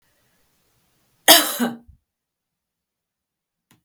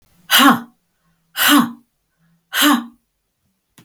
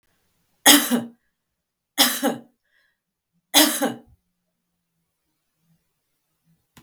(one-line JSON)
{"cough_length": "3.8 s", "cough_amplitude": 32768, "cough_signal_mean_std_ratio": 0.21, "exhalation_length": "3.8 s", "exhalation_amplitude": 32768, "exhalation_signal_mean_std_ratio": 0.39, "three_cough_length": "6.8 s", "three_cough_amplitude": 32768, "three_cough_signal_mean_std_ratio": 0.27, "survey_phase": "beta (2021-08-13 to 2022-03-07)", "age": "65+", "gender": "Female", "wearing_mask": "No", "symptom_none": true, "smoker_status": "Ex-smoker", "respiratory_condition_asthma": false, "respiratory_condition_other": false, "recruitment_source": "REACT", "submission_delay": "4 days", "covid_test_result": "Negative", "covid_test_method": "RT-qPCR"}